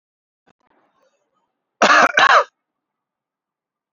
{
  "cough_length": "3.9 s",
  "cough_amplitude": 31174,
  "cough_signal_mean_std_ratio": 0.3,
  "survey_phase": "beta (2021-08-13 to 2022-03-07)",
  "age": "45-64",
  "gender": "Male",
  "wearing_mask": "No",
  "symptom_none": true,
  "smoker_status": "Never smoked",
  "respiratory_condition_asthma": false,
  "respiratory_condition_other": false,
  "recruitment_source": "REACT",
  "submission_delay": "1 day",
  "covid_test_result": "Negative",
  "covid_test_method": "RT-qPCR",
  "influenza_a_test_result": "Unknown/Void",
  "influenza_b_test_result": "Unknown/Void"
}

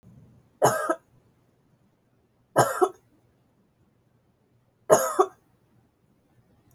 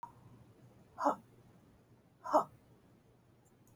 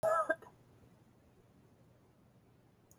{
  "three_cough_length": "6.7 s",
  "three_cough_amplitude": 25408,
  "three_cough_signal_mean_std_ratio": 0.27,
  "exhalation_length": "3.8 s",
  "exhalation_amplitude": 4502,
  "exhalation_signal_mean_std_ratio": 0.27,
  "cough_length": "3.0 s",
  "cough_amplitude": 3415,
  "cough_signal_mean_std_ratio": 0.3,
  "survey_phase": "beta (2021-08-13 to 2022-03-07)",
  "age": "45-64",
  "gender": "Female",
  "wearing_mask": "No",
  "symptom_cough_any": true,
  "symptom_sore_throat": true,
  "symptom_fatigue": true,
  "symptom_headache": true,
  "symptom_onset": "3 days",
  "smoker_status": "Never smoked",
  "respiratory_condition_asthma": false,
  "respiratory_condition_other": false,
  "recruitment_source": "Test and Trace",
  "submission_delay": "1 day",
  "covid_test_result": "Positive",
  "covid_test_method": "RT-qPCR",
  "covid_ct_value": 19.1,
  "covid_ct_gene": "ORF1ab gene",
  "covid_ct_mean": 19.4,
  "covid_viral_load": "440000 copies/ml",
  "covid_viral_load_category": "Low viral load (10K-1M copies/ml)"
}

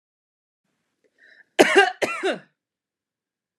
{
  "cough_length": "3.6 s",
  "cough_amplitude": 31899,
  "cough_signal_mean_std_ratio": 0.28,
  "survey_phase": "beta (2021-08-13 to 2022-03-07)",
  "age": "18-44",
  "gender": "Female",
  "wearing_mask": "No",
  "symptom_runny_or_blocked_nose": true,
  "symptom_sore_throat": true,
  "symptom_fatigue": true,
  "smoker_status": "Never smoked",
  "respiratory_condition_asthma": false,
  "respiratory_condition_other": false,
  "recruitment_source": "Test and Trace",
  "submission_delay": "2 days",
  "covid_test_result": "Positive",
  "covid_test_method": "LFT"
}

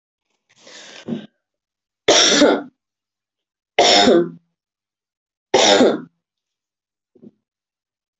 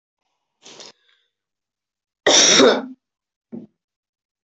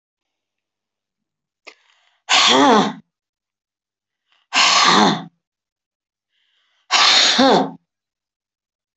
{
  "three_cough_length": "8.2 s",
  "three_cough_amplitude": 29364,
  "three_cough_signal_mean_std_ratio": 0.36,
  "cough_length": "4.4 s",
  "cough_amplitude": 29263,
  "cough_signal_mean_std_ratio": 0.3,
  "exhalation_length": "9.0 s",
  "exhalation_amplitude": 28102,
  "exhalation_signal_mean_std_ratio": 0.4,
  "survey_phase": "beta (2021-08-13 to 2022-03-07)",
  "age": "65+",
  "gender": "Female",
  "wearing_mask": "No",
  "symptom_none": true,
  "smoker_status": "Never smoked",
  "respiratory_condition_asthma": false,
  "respiratory_condition_other": false,
  "recruitment_source": "REACT",
  "submission_delay": "4 days",
  "covid_test_result": "Negative",
  "covid_test_method": "RT-qPCR"
}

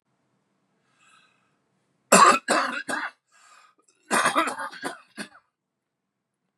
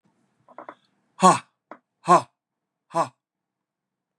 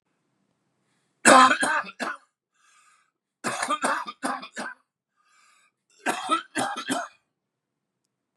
{
  "cough_length": "6.6 s",
  "cough_amplitude": 30267,
  "cough_signal_mean_std_ratio": 0.31,
  "exhalation_length": "4.2 s",
  "exhalation_amplitude": 23621,
  "exhalation_signal_mean_std_ratio": 0.23,
  "three_cough_length": "8.4 s",
  "three_cough_amplitude": 31972,
  "three_cough_signal_mean_std_ratio": 0.33,
  "survey_phase": "beta (2021-08-13 to 2022-03-07)",
  "age": "65+",
  "gender": "Male",
  "wearing_mask": "No",
  "symptom_cough_any": true,
  "symptom_new_continuous_cough": true,
  "symptom_shortness_of_breath": true,
  "symptom_sore_throat": true,
  "symptom_onset": "12 days",
  "smoker_status": "Ex-smoker",
  "respiratory_condition_asthma": false,
  "respiratory_condition_other": false,
  "recruitment_source": "REACT",
  "submission_delay": "0 days",
  "covid_test_result": "Negative",
  "covid_test_method": "RT-qPCR",
  "influenza_a_test_result": "Negative",
  "influenza_b_test_result": "Negative"
}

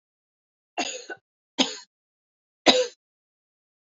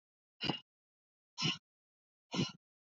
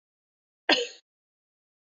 {
  "three_cough_length": "3.9 s",
  "three_cough_amplitude": 25920,
  "three_cough_signal_mean_std_ratio": 0.25,
  "exhalation_length": "3.0 s",
  "exhalation_amplitude": 3071,
  "exhalation_signal_mean_std_ratio": 0.31,
  "cough_length": "1.9 s",
  "cough_amplitude": 18346,
  "cough_signal_mean_std_ratio": 0.22,
  "survey_phase": "beta (2021-08-13 to 2022-03-07)",
  "age": "45-64",
  "gender": "Female",
  "wearing_mask": "No",
  "symptom_none": true,
  "smoker_status": "Never smoked",
  "respiratory_condition_asthma": false,
  "respiratory_condition_other": false,
  "recruitment_source": "REACT",
  "submission_delay": "2 days",
  "covid_test_result": "Negative",
  "covid_test_method": "RT-qPCR",
  "influenza_a_test_result": "Unknown/Void",
  "influenza_b_test_result": "Unknown/Void"
}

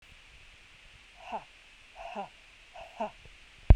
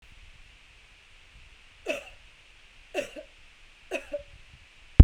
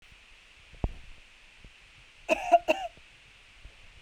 {
  "exhalation_length": "3.8 s",
  "exhalation_amplitude": 19298,
  "exhalation_signal_mean_std_ratio": 0.18,
  "three_cough_length": "5.0 s",
  "three_cough_amplitude": 32768,
  "three_cough_signal_mean_std_ratio": 0.14,
  "cough_length": "4.0 s",
  "cough_amplitude": 11811,
  "cough_signal_mean_std_ratio": 0.29,
  "survey_phase": "beta (2021-08-13 to 2022-03-07)",
  "age": "18-44",
  "gender": "Female",
  "wearing_mask": "No",
  "symptom_runny_or_blocked_nose": true,
  "symptom_fever_high_temperature": true,
  "symptom_headache": true,
  "smoker_status": "Never smoked",
  "respiratory_condition_asthma": false,
  "respiratory_condition_other": false,
  "recruitment_source": "Test and Trace",
  "submission_delay": "2 days",
  "covid_test_result": "Positive",
  "covid_test_method": "ePCR"
}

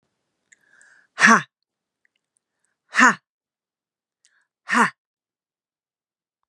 {
  "exhalation_length": "6.5 s",
  "exhalation_amplitude": 32506,
  "exhalation_signal_mean_std_ratio": 0.22,
  "survey_phase": "beta (2021-08-13 to 2022-03-07)",
  "age": "45-64",
  "gender": "Female",
  "wearing_mask": "No",
  "symptom_abdominal_pain": true,
  "symptom_diarrhoea": true,
  "symptom_fatigue": true,
  "symptom_onset": "4 days",
  "smoker_status": "Ex-smoker",
  "respiratory_condition_asthma": true,
  "respiratory_condition_other": false,
  "recruitment_source": "REACT",
  "submission_delay": "2 days",
  "covid_test_result": "Negative",
  "covid_test_method": "RT-qPCR",
  "influenza_a_test_result": "Unknown/Void",
  "influenza_b_test_result": "Unknown/Void"
}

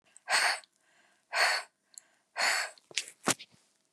{
  "exhalation_length": "3.9 s",
  "exhalation_amplitude": 16606,
  "exhalation_signal_mean_std_ratio": 0.42,
  "survey_phase": "beta (2021-08-13 to 2022-03-07)",
  "age": "65+",
  "gender": "Female",
  "wearing_mask": "No",
  "symptom_cough_any": true,
  "smoker_status": "Never smoked",
  "respiratory_condition_asthma": false,
  "respiratory_condition_other": false,
  "recruitment_source": "REACT",
  "submission_delay": "1 day",
  "covid_test_result": "Negative",
  "covid_test_method": "RT-qPCR",
  "influenza_a_test_result": "Unknown/Void",
  "influenza_b_test_result": "Unknown/Void"
}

